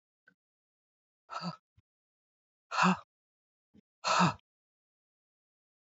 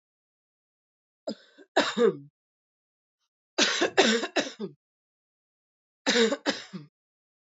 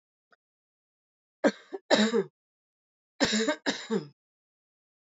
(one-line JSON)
{"exhalation_length": "5.8 s", "exhalation_amplitude": 6187, "exhalation_signal_mean_std_ratio": 0.26, "three_cough_length": "7.5 s", "three_cough_amplitude": 13896, "three_cough_signal_mean_std_ratio": 0.36, "cough_length": "5.0 s", "cough_amplitude": 15640, "cough_signal_mean_std_ratio": 0.34, "survey_phase": "alpha (2021-03-01 to 2021-08-12)", "age": "18-44", "gender": "Female", "wearing_mask": "No", "symptom_none": true, "symptom_onset": "7 days", "smoker_status": "Current smoker (e-cigarettes or vapes only)", "respiratory_condition_asthma": false, "respiratory_condition_other": false, "recruitment_source": "REACT", "submission_delay": "31 days", "covid_test_result": "Negative", "covid_test_method": "RT-qPCR"}